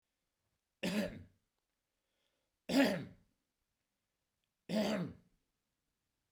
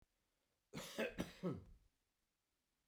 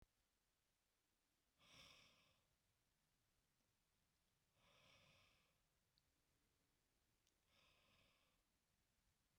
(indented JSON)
{
  "three_cough_length": "6.3 s",
  "three_cough_amplitude": 3703,
  "three_cough_signal_mean_std_ratio": 0.32,
  "cough_length": "2.9 s",
  "cough_amplitude": 1100,
  "cough_signal_mean_std_ratio": 0.38,
  "exhalation_length": "9.4 s",
  "exhalation_amplitude": 57,
  "exhalation_signal_mean_std_ratio": 0.61,
  "survey_phase": "beta (2021-08-13 to 2022-03-07)",
  "age": "45-64",
  "gender": "Male",
  "wearing_mask": "No",
  "symptom_none": true,
  "smoker_status": "Ex-smoker",
  "respiratory_condition_asthma": false,
  "respiratory_condition_other": false,
  "recruitment_source": "REACT",
  "submission_delay": "1 day",
  "covid_test_result": "Negative",
  "covid_test_method": "RT-qPCR"
}